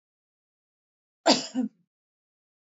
cough_length: 2.6 s
cough_amplitude: 17114
cough_signal_mean_std_ratio: 0.24
survey_phase: alpha (2021-03-01 to 2021-08-12)
age: 45-64
gender: Female
wearing_mask: 'No'
symptom_none: true
smoker_status: Never smoked
respiratory_condition_asthma: false
respiratory_condition_other: false
recruitment_source: REACT
submission_delay: 2 days
covid_test_result: Negative
covid_test_method: RT-qPCR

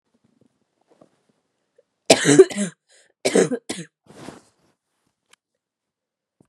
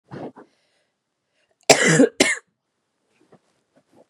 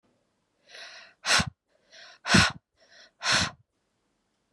three_cough_length: 6.5 s
three_cough_amplitude: 32767
three_cough_signal_mean_std_ratio: 0.23
cough_length: 4.1 s
cough_amplitude: 32768
cough_signal_mean_std_ratio: 0.28
exhalation_length: 4.5 s
exhalation_amplitude: 14832
exhalation_signal_mean_std_ratio: 0.32
survey_phase: beta (2021-08-13 to 2022-03-07)
age: 18-44
gender: Female
wearing_mask: 'No'
symptom_cough_any: true
symptom_runny_or_blocked_nose: true
symptom_sore_throat: true
symptom_headache: true
symptom_change_to_sense_of_smell_or_taste: true
symptom_onset: 4 days
smoker_status: Never smoked
respiratory_condition_asthma: false
respiratory_condition_other: false
recruitment_source: Test and Trace
submission_delay: 2 days
covid_test_result: Positive
covid_test_method: ePCR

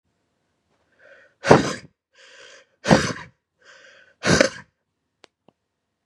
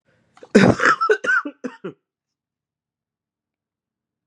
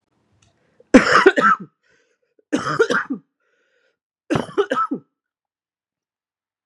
exhalation_length: 6.1 s
exhalation_amplitude: 32768
exhalation_signal_mean_std_ratio: 0.25
cough_length: 4.3 s
cough_amplitude: 32710
cough_signal_mean_std_ratio: 0.33
three_cough_length: 6.7 s
three_cough_amplitude: 32768
three_cough_signal_mean_std_ratio: 0.33
survey_phase: beta (2021-08-13 to 2022-03-07)
age: 18-44
gender: Male
wearing_mask: 'No'
symptom_cough_any: true
symptom_runny_or_blocked_nose: true
symptom_sore_throat: true
symptom_fatigue: true
symptom_loss_of_taste: true
symptom_onset: 4 days
smoker_status: Current smoker (e-cigarettes or vapes only)
respiratory_condition_asthma: false
respiratory_condition_other: false
recruitment_source: Test and Trace
submission_delay: 2 days
covid_test_result: Positive
covid_test_method: RT-qPCR
covid_ct_value: 17.5
covid_ct_gene: ORF1ab gene
covid_ct_mean: 17.8
covid_viral_load: 1400000 copies/ml
covid_viral_load_category: High viral load (>1M copies/ml)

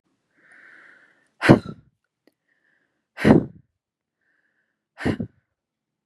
exhalation_length: 6.1 s
exhalation_amplitude: 32768
exhalation_signal_mean_std_ratio: 0.21
survey_phase: beta (2021-08-13 to 2022-03-07)
age: 18-44
gender: Female
wearing_mask: 'No'
symptom_cough_any: true
symptom_runny_or_blocked_nose: true
symptom_sore_throat: true
symptom_diarrhoea: true
symptom_fatigue: true
symptom_headache: true
symptom_loss_of_taste: true
symptom_onset: 5 days
smoker_status: Ex-smoker
respiratory_condition_asthma: false
respiratory_condition_other: false
recruitment_source: Test and Trace
submission_delay: 2 days
covid_test_result: Positive
covid_test_method: RT-qPCR
covid_ct_value: 18.2
covid_ct_gene: ORF1ab gene
covid_ct_mean: 18.4
covid_viral_load: 930000 copies/ml
covid_viral_load_category: Low viral load (10K-1M copies/ml)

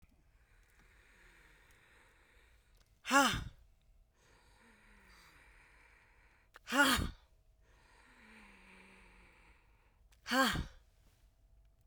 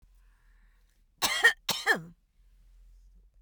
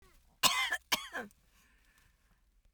exhalation_length: 11.9 s
exhalation_amplitude: 6186
exhalation_signal_mean_std_ratio: 0.27
cough_length: 3.4 s
cough_amplitude: 10971
cough_signal_mean_std_ratio: 0.31
three_cough_length: 2.7 s
three_cough_amplitude: 10356
three_cough_signal_mean_std_ratio: 0.33
survey_phase: beta (2021-08-13 to 2022-03-07)
age: 65+
gender: Female
wearing_mask: 'No'
symptom_none: true
smoker_status: Never smoked
respiratory_condition_asthma: false
respiratory_condition_other: false
recruitment_source: REACT
submission_delay: 6 days
covid_test_result: Negative
covid_test_method: RT-qPCR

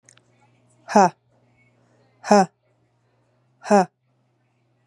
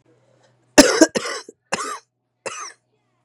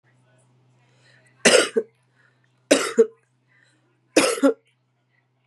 exhalation_length: 4.9 s
exhalation_amplitude: 31568
exhalation_signal_mean_std_ratio: 0.25
cough_length: 3.2 s
cough_amplitude: 32768
cough_signal_mean_std_ratio: 0.28
three_cough_length: 5.5 s
three_cough_amplitude: 30472
three_cough_signal_mean_std_ratio: 0.3
survey_phase: beta (2021-08-13 to 2022-03-07)
age: 18-44
gender: Female
wearing_mask: 'No'
symptom_cough_any: true
symptom_runny_or_blocked_nose: true
symptom_shortness_of_breath: true
symptom_fatigue: true
symptom_fever_high_temperature: true
symptom_headache: true
symptom_change_to_sense_of_smell_or_taste: true
symptom_loss_of_taste: true
symptom_onset: 2 days
smoker_status: Ex-smoker
respiratory_condition_asthma: true
respiratory_condition_other: false
recruitment_source: Test and Trace
submission_delay: 1 day
covid_test_result: Positive
covid_test_method: ePCR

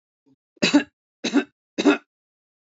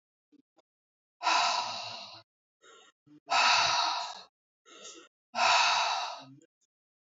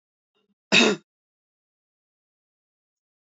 three_cough_length: 2.6 s
three_cough_amplitude: 19779
three_cough_signal_mean_std_ratio: 0.33
exhalation_length: 7.1 s
exhalation_amplitude: 7183
exhalation_signal_mean_std_ratio: 0.48
cough_length: 3.2 s
cough_amplitude: 19687
cough_signal_mean_std_ratio: 0.21
survey_phase: beta (2021-08-13 to 2022-03-07)
age: 45-64
gender: Female
wearing_mask: 'No'
symptom_none: true
smoker_status: Ex-smoker
respiratory_condition_asthma: false
respiratory_condition_other: false
recruitment_source: REACT
submission_delay: 2 days
covid_test_result: Negative
covid_test_method: RT-qPCR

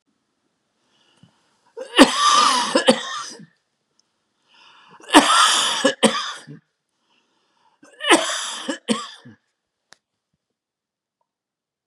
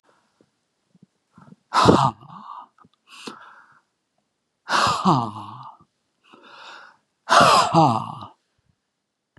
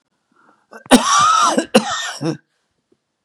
three_cough_length: 11.9 s
three_cough_amplitude: 32768
three_cough_signal_mean_std_ratio: 0.35
exhalation_length: 9.4 s
exhalation_amplitude: 29491
exhalation_signal_mean_std_ratio: 0.35
cough_length: 3.2 s
cough_amplitude: 32768
cough_signal_mean_std_ratio: 0.47
survey_phase: beta (2021-08-13 to 2022-03-07)
age: 65+
gender: Male
wearing_mask: 'No'
symptom_none: true
smoker_status: Never smoked
respiratory_condition_asthma: false
respiratory_condition_other: false
recruitment_source: REACT
submission_delay: 5 days
covid_test_result: Negative
covid_test_method: RT-qPCR
influenza_a_test_result: Negative
influenza_b_test_result: Negative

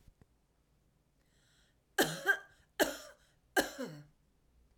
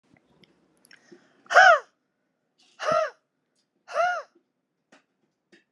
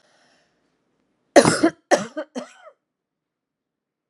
three_cough_length: 4.8 s
three_cough_amplitude: 6460
three_cough_signal_mean_std_ratio: 0.29
exhalation_length: 5.7 s
exhalation_amplitude: 25473
exhalation_signal_mean_std_ratio: 0.26
cough_length: 4.1 s
cough_amplitude: 32767
cough_signal_mean_std_ratio: 0.24
survey_phase: alpha (2021-03-01 to 2021-08-12)
age: 45-64
gender: Female
wearing_mask: 'No'
symptom_none: true
smoker_status: Never smoked
respiratory_condition_asthma: false
respiratory_condition_other: false
recruitment_source: REACT
submission_delay: 2 days
covid_test_result: Negative
covid_test_method: RT-qPCR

